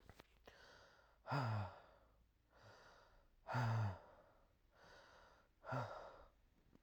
{"exhalation_length": "6.8 s", "exhalation_amplitude": 1162, "exhalation_signal_mean_std_ratio": 0.43, "survey_phase": "alpha (2021-03-01 to 2021-08-12)", "age": "18-44", "gender": "Male", "wearing_mask": "No", "symptom_none": true, "smoker_status": "Current smoker (11 or more cigarettes per day)", "respiratory_condition_asthma": false, "respiratory_condition_other": false, "recruitment_source": "REACT", "submission_delay": "1 day", "covid_test_result": "Negative", "covid_test_method": "RT-qPCR"}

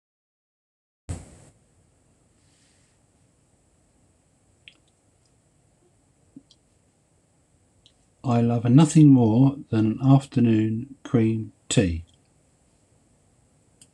{"exhalation_length": "13.9 s", "exhalation_amplitude": 20528, "exhalation_signal_mean_std_ratio": 0.36, "survey_phase": "alpha (2021-03-01 to 2021-08-12)", "age": "65+", "gender": "Male", "wearing_mask": "No", "symptom_none": true, "symptom_shortness_of_breath": true, "smoker_status": "Ex-smoker", "respiratory_condition_asthma": false, "respiratory_condition_other": false, "recruitment_source": "REACT", "submission_delay": "2 days", "covid_test_result": "Negative", "covid_test_method": "RT-qPCR"}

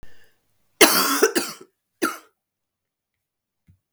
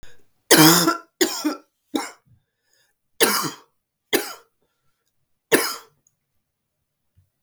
{"cough_length": "3.9 s", "cough_amplitude": 32768, "cough_signal_mean_std_ratio": 0.32, "three_cough_length": "7.4 s", "three_cough_amplitude": 32768, "three_cough_signal_mean_std_ratio": 0.32, "survey_phase": "beta (2021-08-13 to 2022-03-07)", "age": "45-64", "gender": "Female", "wearing_mask": "No", "symptom_cough_any": true, "symptom_new_continuous_cough": true, "symptom_runny_or_blocked_nose": true, "symptom_sore_throat": true, "symptom_fever_high_temperature": true, "symptom_headache": true, "symptom_change_to_sense_of_smell_or_taste": true, "symptom_loss_of_taste": true, "symptom_onset": "6 days", "smoker_status": "Never smoked", "respiratory_condition_asthma": true, "respiratory_condition_other": false, "recruitment_source": "Test and Trace", "submission_delay": "2 days", "covid_test_result": "Positive", "covid_test_method": "RT-qPCR", "covid_ct_value": 18.9, "covid_ct_gene": "N gene"}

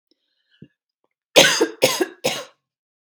{"cough_length": "3.1 s", "cough_amplitude": 32767, "cough_signal_mean_std_ratio": 0.33, "survey_phase": "beta (2021-08-13 to 2022-03-07)", "age": "45-64", "gender": "Female", "wearing_mask": "No", "symptom_shortness_of_breath": true, "symptom_fatigue": true, "symptom_onset": "12 days", "smoker_status": "Never smoked", "respiratory_condition_asthma": false, "respiratory_condition_other": false, "recruitment_source": "REACT", "submission_delay": "1 day", "covid_test_result": "Negative", "covid_test_method": "RT-qPCR"}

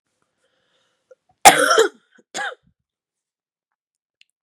{"cough_length": "4.4 s", "cough_amplitude": 32768, "cough_signal_mean_std_ratio": 0.23, "survey_phase": "beta (2021-08-13 to 2022-03-07)", "age": "18-44", "gender": "Female", "wearing_mask": "No", "symptom_cough_any": true, "symptom_new_continuous_cough": true, "symptom_runny_or_blocked_nose": true, "symptom_sore_throat": true, "symptom_fatigue": true, "smoker_status": "Ex-smoker", "respiratory_condition_asthma": true, "respiratory_condition_other": false, "recruitment_source": "Test and Trace", "submission_delay": "0 days", "covid_test_result": "Positive", "covid_test_method": "LFT"}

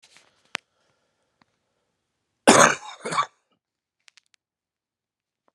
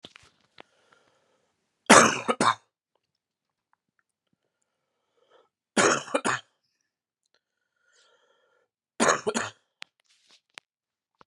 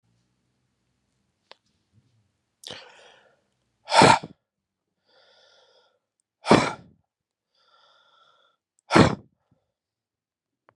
{"cough_length": "5.5 s", "cough_amplitude": 32768, "cough_signal_mean_std_ratio": 0.2, "three_cough_length": "11.3 s", "three_cough_amplitude": 31419, "three_cough_signal_mean_std_ratio": 0.23, "exhalation_length": "10.8 s", "exhalation_amplitude": 30323, "exhalation_signal_mean_std_ratio": 0.19, "survey_phase": "beta (2021-08-13 to 2022-03-07)", "age": "18-44", "gender": "Male", "wearing_mask": "No", "symptom_cough_any": true, "symptom_sore_throat": true, "symptom_diarrhoea": true, "symptom_fatigue": true, "symptom_fever_high_temperature": true, "symptom_headache": true, "symptom_onset": "5 days", "smoker_status": "Never smoked", "respiratory_condition_asthma": false, "respiratory_condition_other": false, "recruitment_source": "Test and Trace", "submission_delay": "2 days", "covid_test_result": "Positive", "covid_test_method": "RT-qPCR", "covid_ct_value": 16.8, "covid_ct_gene": "ORF1ab gene"}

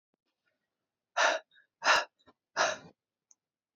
{"exhalation_length": "3.8 s", "exhalation_amplitude": 8698, "exhalation_signal_mean_std_ratio": 0.31, "survey_phase": "beta (2021-08-13 to 2022-03-07)", "age": "18-44", "gender": "Female", "wearing_mask": "No", "symptom_sore_throat": true, "symptom_fatigue": true, "symptom_headache": true, "symptom_onset": "2 days", "smoker_status": "Current smoker (e-cigarettes or vapes only)", "respiratory_condition_asthma": false, "respiratory_condition_other": false, "recruitment_source": "Test and Trace", "submission_delay": "2 days", "covid_test_result": "Negative", "covid_test_method": "RT-qPCR"}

